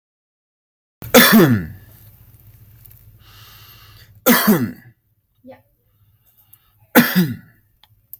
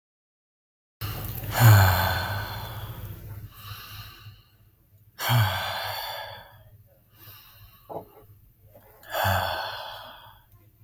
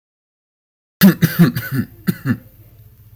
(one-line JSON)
{"three_cough_length": "8.2 s", "three_cough_amplitude": 32768, "three_cough_signal_mean_std_ratio": 0.33, "exhalation_length": "10.8 s", "exhalation_amplitude": 19500, "exhalation_signal_mean_std_ratio": 0.42, "cough_length": "3.2 s", "cough_amplitude": 32768, "cough_signal_mean_std_ratio": 0.37, "survey_phase": "beta (2021-08-13 to 2022-03-07)", "age": "18-44", "gender": "Male", "wearing_mask": "No", "symptom_none": true, "smoker_status": "Never smoked", "respiratory_condition_asthma": false, "respiratory_condition_other": false, "recruitment_source": "REACT", "submission_delay": "2 days", "covid_test_result": "Negative", "covid_test_method": "RT-qPCR", "influenza_a_test_result": "Negative", "influenza_b_test_result": "Negative"}